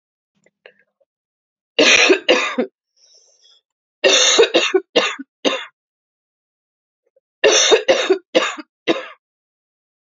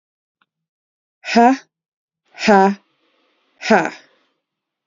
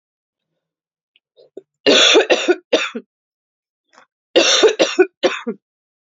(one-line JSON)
{"three_cough_length": "10.1 s", "three_cough_amplitude": 32040, "three_cough_signal_mean_std_ratio": 0.41, "exhalation_length": "4.9 s", "exhalation_amplitude": 31243, "exhalation_signal_mean_std_ratio": 0.32, "cough_length": "6.1 s", "cough_amplitude": 32767, "cough_signal_mean_std_ratio": 0.4, "survey_phase": "beta (2021-08-13 to 2022-03-07)", "age": "45-64", "gender": "Female", "wearing_mask": "No", "symptom_cough_any": true, "symptom_runny_or_blocked_nose": true, "symptom_sore_throat": true, "symptom_onset": "5 days", "smoker_status": "Never smoked", "respiratory_condition_asthma": false, "respiratory_condition_other": false, "recruitment_source": "Test and Trace", "submission_delay": "1 day", "covid_test_result": "Positive", "covid_test_method": "RT-qPCR", "covid_ct_value": 18.2, "covid_ct_gene": "ORF1ab gene", "covid_ct_mean": 18.4, "covid_viral_load": "890000 copies/ml", "covid_viral_load_category": "Low viral load (10K-1M copies/ml)"}